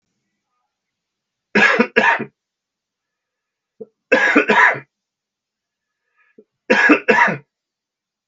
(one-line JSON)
{"three_cough_length": "8.3 s", "three_cough_amplitude": 32768, "three_cough_signal_mean_std_ratio": 0.37, "survey_phase": "beta (2021-08-13 to 2022-03-07)", "age": "65+", "gender": "Male", "wearing_mask": "No", "symptom_none": true, "smoker_status": "Never smoked", "respiratory_condition_asthma": false, "respiratory_condition_other": false, "recruitment_source": "REACT", "submission_delay": "1 day", "covid_test_result": "Negative", "covid_test_method": "RT-qPCR", "influenza_a_test_result": "Negative", "influenza_b_test_result": "Negative"}